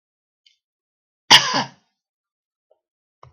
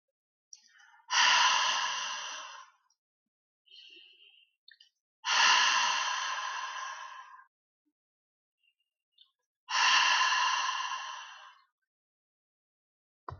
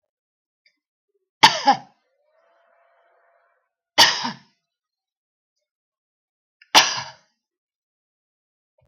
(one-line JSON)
{"cough_length": "3.3 s", "cough_amplitude": 32768, "cough_signal_mean_std_ratio": 0.2, "exhalation_length": "13.4 s", "exhalation_amplitude": 8376, "exhalation_signal_mean_std_ratio": 0.46, "three_cough_length": "8.9 s", "three_cough_amplitude": 32768, "three_cough_signal_mean_std_ratio": 0.2, "survey_phase": "beta (2021-08-13 to 2022-03-07)", "age": "65+", "gender": "Female", "wearing_mask": "No", "symptom_none": true, "smoker_status": "Ex-smoker", "respiratory_condition_asthma": false, "respiratory_condition_other": false, "recruitment_source": "REACT", "submission_delay": "1 day", "covid_test_result": "Negative", "covid_test_method": "RT-qPCR", "influenza_a_test_result": "Negative", "influenza_b_test_result": "Negative"}